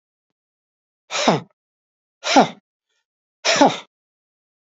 exhalation_length: 4.7 s
exhalation_amplitude: 28078
exhalation_signal_mean_std_ratio: 0.29
survey_phase: beta (2021-08-13 to 2022-03-07)
age: 65+
gender: Male
wearing_mask: 'No'
symptom_cough_any: true
symptom_runny_or_blocked_nose: true
symptom_sore_throat: true
symptom_other: true
smoker_status: Never smoked
respiratory_condition_asthma: false
respiratory_condition_other: false
recruitment_source: Test and Trace
submission_delay: 3 days
covid_test_result: Positive
covid_test_method: RT-qPCR
covid_ct_value: 27.1
covid_ct_gene: ORF1ab gene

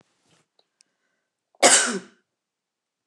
cough_length: 3.1 s
cough_amplitude: 28161
cough_signal_mean_std_ratio: 0.24
survey_phase: beta (2021-08-13 to 2022-03-07)
age: 45-64
gender: Female
wearing_mask: 'No'
symptom_none: true
smoker_status: Never smoked
respiratory_condition_asthma: false
respiratory_condition_other: false
recruitment_source: REACT
submission_delay: 2 days
covid_test_result: Negative
covid_test_method: RT-qPCR
influenza_a_test_result: Negative
influenza_b_test_result: Negative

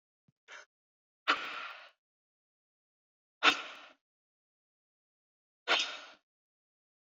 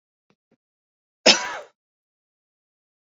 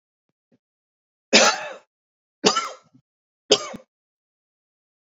exhalation_length: 7.1 s
exhalation_amplitude: 9166
exhalation_signal_mean_std_ratio: 0.23
cough_length: 3.1 s
cough_amplitude: 30901
cough_signal_mean_std_ratio: 0.18
three_cough_length: 5.1 s
three_cough_amplitude: 30500
three_cough_signal_mean_std_ratio: 0.25
survey_phase: beta (2021-08-13 to 2022-03-07)
age: 45-64
gender: Female
wearing_mask: 'No'
symptom_none: true
smoker_status: Never smoked
respiratory_condition_asthma: false
respiratory_condition_other: false
recruitment_source: REACT
submission_delay: 2 days
covid_test_result: Negative
covid_test_method: RT-qPCR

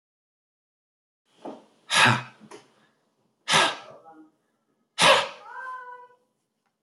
exhalation_length: 6.8 s
exhalation_amplitude: 18805
exhalation_signal_mean_std_ratio: 0.31
survey_phase: beta (2021-08-13 to 2022-03-07)
age: 18-44
gender: Male
wearing_mask: 'No'
symptom_none: true
smoker_status: Ex-smoker
respiratory_condition_asthma: false
respiratory_condition_other: false
recruitment_source: REACT
submission_delay: 2 days
covid_test_result: Negative
covid_test_method: RT-qPCR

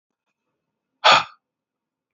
exhalation_length: 2.1 s
exhalation_amplitude: 29793
exhalation_signal_mean_std_ratio: 0.22
survey_phase: beta (2021-08-13 to 2022-03-07)
age: 18-44
gender: Male
wearing_mask: 'No'
symptom_none: true
smoker_status: Never smoked
respiratory_condition_asthma: false
respiratory_condition_other: false
recruitment_source: REACT
submission_delay: 1 day
covid_test_result: Negative
covid_test_method: RT-qPCR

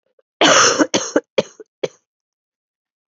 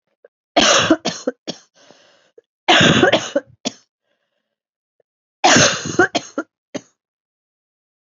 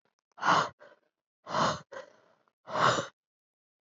cough_length: 3.1 s
cough_amplitude: 29793
cough_signal_mean_std_ratio: 0.37
three_cough_length: 8.0 s
three_cough_amplitude: 32767
three_cough_signal_mean_std_ratio: 0.38
exhalation_length: 3.9 s
exhalation_amplitude: 8217
exhalation_signal_mean_std_ratio: 0.38
survey_phase: beta (2021-08-13 to 2022-03-07)
age: 45-64
gender: Female
wearing_mask: 'No'
symptom_cough_any: true
symptom_runny_or_blocked_nose: true
symptom_shortness_of_breath: true
symptom_sore_throat: true
symptom_fatigue: true
symptom_headache: true
symptom_other: true
symptom_onset: 3 days
smoker_status: Never smoked
respiratory_condition_asthma: true
respiratory_condition_other: false
recruitment_source: Test and Trace
submission_delay: 1 day
covid_test_result: Positive
covid_test_method: RT-qPCR
covid_ct_value: 18.4
covid_ct_gene: ORF1ab gene
covid_ct_mean: 19.4
covid_viral_load: 430000 copies/ml
covid_viral_load_category: Low viral load (10K-1M copies/ml)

